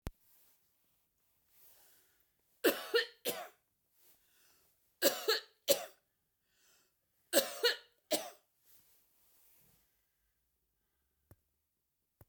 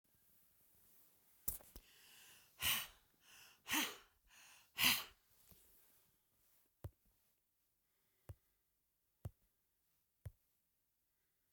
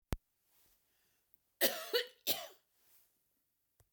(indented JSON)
{
  "three_cough_length": "12.3 s",
  "three_cough_amplitude": 7396,
  "three_cough_signal_mean_std_ratio": 0.25,
  "exhalation_length": "11.5 s",
  "exhalation_amplitude": 3921,
  "exhalation_signal_mean_std_ratio": 0.25,
  "cough_length": "3.9 s",
  "cough_amplitude": 5089,
  "cough_signal_mean_std_ratio": 0.27,
  "survey_phase": "beta (2021-08-13 to 2022-03-07)",
  "age": "65+",
  "gender": "Female",
  "wearing_mask": "No",
  "symptom_none": true,
  "smoker_status": "Ex-smoker",
  "respiratory_condition_asthma": false,
  "respiratory_condition_other": false,
  "recruitment_source": "REACT",
  "submission_delay": "1 day",
  "covid_test_result": "Negative",
  "covid_test_method": "RT-qPCR"
}